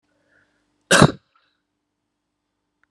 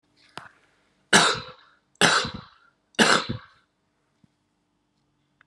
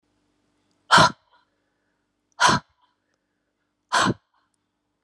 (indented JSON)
{
  "cough_length": "2.9 s",
  "cough_amplitude": 32768,
  "cough_signal_mean_std_ratio": 0.19,
  "three_cough_length": "5.5 s",
  "three_cough_amplitude": 30508,
  "three_cough_signal_mean_std_ratio": 0.3,
  "exhalation_length": "5.0 s",
  "exhalation_amplitude": 27600,
  "exhalation_signal_mean_std_ratio": 0.26,
  "survey_phase": "beta (2021-08-13 to 2022-03-07)",
  "age": "65+",
  "gender": "Female",
  "wearing_mask": "No",
  "symptom_runny_or_blocked_nose": true,
  "symptom_sore_throat": true,
  "symptom_diarrhoea": true,
  "symptom_headache": true,
  "symptom_change_to_sense_of_smell_or_taste": true,
  "symptom_loss_of_taste": true,
  "smoker_status": "Current smoker (1 to 10 cigarettes per day)",
  "respiratory_condition_asthma": false,
  "respiratory_condition_other": false,
  "recruitment_source": "Test and Trace",
  "submission_delay": "2 days",
  "covid_test_result": "Positive",
  "covid_test_method": "RT-qPCR",
  "covid_ct_value": 19.1,
  "covid_ct_gene": "ORF1ab gene",
  "covid_ct_mean": 19.8,
  "covid_viral_load": "330000 copies/ml",
  "covid_viral_load_category": "Low viral load (10K-1M copies/ml)"
}